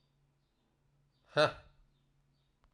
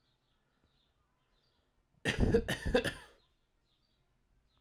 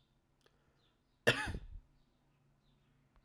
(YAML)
exhalation_length: 2.7 s
exhalation_amplitude: 7215
exhalation_signal_mean_std_ratio: 0.19
three_cough_length: 4.6 s
three_cough_amplitude: 5790
three_cough_signal_mean_std_ratio: 0.31
cough_length: 3.2 s
cough_amplitude: 5622
cough_signal_mean_std_ratio: 0.24
survey_phase: alpha (2021-03-01 to 2021-08-12)
age: 18-44
gender: Male
wearing_mask: 'No'
symptom_cough_any: true
symptom_shortness_of_breath: true
symptom_change_to_sense_of_smell_or_taste: true
symptom_loss_of_taste: true
symptom_onset: 3 days
smoker_status: Never smoked
respiratory_condition_asthma: false
respiratory_condition_other: false
recruitment_source: Test and Trace
submission_delay: 2 days
covid_test_result: Positive
covid_test_method: RT-qPCR
covid_ct_value: 14.5
covid_ct_gene: N gene
covid_ct_mean: 15.7
covid_viral_load: 7100000 copies/ml
covid_viral_load_category: High viral load (>1M copies/ml)